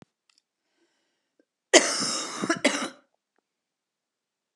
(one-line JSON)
{"cough_length": "4.6 s", "cough_amplitude": 29858, "cough_signal_mean_std_ratio": 0.29, "survey_phase": "alpha (2021-03-01 to 2021-08-12)", "age": "45-64", "gender": "Female", "wearing_mask": "No", "symptom_cough_any": true, "symptom_fatigue": true, "symptom_fever_high_temperature": true, "symptom_headache": true, "symptom_onset": "3 days", "smoker_status": "Never smoked", "respiratory_condition_asthma": false, "respiratory_condition_other": false, "recruitment_source": "Test and Trace", "submission_delay": "2 days", "covid_test_result": "Positive", "covid_test_method": "RT-qPCR", "covid_ct_value": 17.2, "covid_ct_gene": "ORF1ab gene", "covid_ct_mean": 18.6, "covid_viral_load": "800000 copies/ml", "covid_viral_load_category": "Low viral load (10K-1M copies/ml)"}